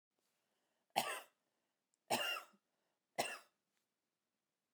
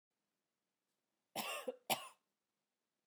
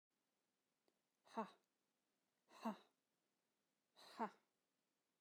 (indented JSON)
{
  "three_cough_length": "4.7 s",
  "three_cough_amplitude": 4737,
  "three_cough_signal_mean_std_ratio": 0.29,
  "cough_length": "3.1 s",
  "cough_amplitude": 2320,
  "cough_signal_mean_std_ratio": 0.29,
  "exhalation_length": "5.2 s",
  "exhalation_amplitude": 807,
  "exhalation_signal_mean_std_ratio": 0.22,
  "survey_phase": "beta (2021-08-13 to 2022-03-07)",
  "age": "45-64",
  "gender": "Female",
  "wearing_mask": "No",
  "symptom_sore_throat": true,
  "smoker_status": "Never smoked",
  "respiratory_condition_asthma": false,
  "respiratory_condition_other": false,
  "recruitment_source": "REACT",
  "submission_delay": "1 day",
  "covid_test_result": "Negative",
  "covid_test_method": "RT-qPCR"
}